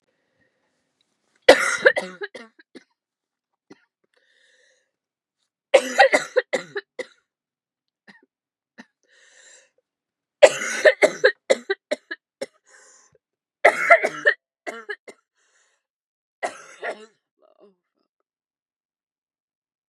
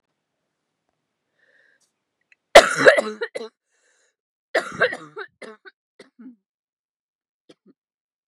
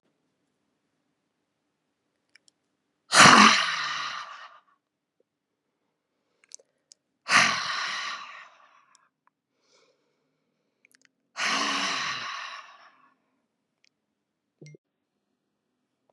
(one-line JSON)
{"three_cough_length": "19.9 s", "three_cough_amplitude": 32768, "three_cough_signal_mean_std_ratio": 0.23, "cough_length": "8.3 s", "cough_amplitude": 32768, "cough_signal_mean_std_ratio": 0.2, "exhalation_length": "16.1 s", "exhalation_amplitude": 31390, "exhalation_signal_mean_std_ratio": 0.26, "survey_phase": "beta (2021-08-13 to 2022-03-07)", "age": "45-64", "gender": "Female", "wearing_mask": "No", "symptom_cough_any": true, "symptom_new_continuous_cough": true, "symptom_runny_or_blocked_nose": true, "symptom_sore_throat": true, "symptom_diarrhoea": true, "symptom_fatigue": true, "symptom_headache": true, "symptom_change_to_sense_of_smell_or_taste": true, "symptom_onset": "2 days", "smoker_status": "Never smoked", "respiratory_condition_asthma": false, "respiratory_condition_other": false, "recruitment_source": "Test and Trace", "submission_delay": "1 day", "covid_test_result": "Positive", "covid_test_method": "RT-qPCR", "covid_ct_value": 21.7, "covid_ct_gene": "N gene", "covid_ct_mean": 21.8, "covid_viral_load": "72000 copies/ml", "covid_viral_load_category": "Low viral load (10K-1M copies/ml)"}